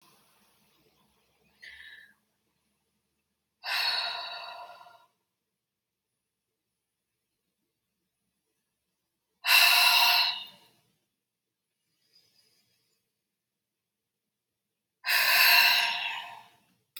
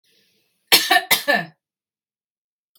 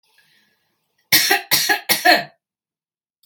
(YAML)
exhalation_length: 17.0 s
exhalation_amplitude: 13736
exhalation_signal_mean_std_ratio: 0.31
cough_length: 2.8 s
cough_amplitude: 32768
cough_signal_mean_std_ratio: 0.32
three_cough_length: 3.3 s
three_cough_amplitude: 32768
three_cough_signal_mean_std_ratio: 0.39
survey_phase: beta (2021-08-13 to 2022-03-07)
age: 45-64
gender: Female
wearing_mask: 'No'
symptom_none: true
smoker_status: Never smoked
respiratory_condition_asthma: false
respiratory_condition_other: false
recruitment_source: REACT
submission_delay: 3 days
covid_test_result: Negative
covid_test_method: RT-qPCR
influenza_a_test_result: Negative
influenza_b_test_result: Negative